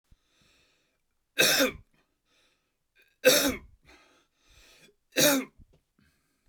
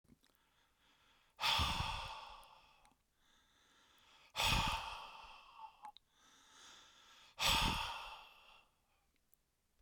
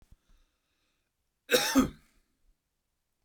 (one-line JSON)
{"three_cough_length": "6.5 s", "three_cough_amplitude": 17081, "three_cough_signal_mean_std_ratio": 0.3, "exhalation_length": "9.8 s", "exhalation_amplitude": 3057, "exhalation_signal_mean_std_ratio": 0.4, "cough_length": "3.2 s", "cough_amplitude": 11529, "cough_signal_mean_std_ratio": 0.26, "survey_phase": "beta (2021-08-13 to 2022-03-07)", "age": "45-64", "gender": "Male", "wearing_mask": "No", "symptom_none": true, "smoker_status": "Never smoked", "respiratory_condition_asthma": false, "respiratory_condition_other": false, "recruitment_source": "REACT", "submission_delay": "2 days", "covid_test_result": "Negative", "covid_test_method": "RT-qPCR"}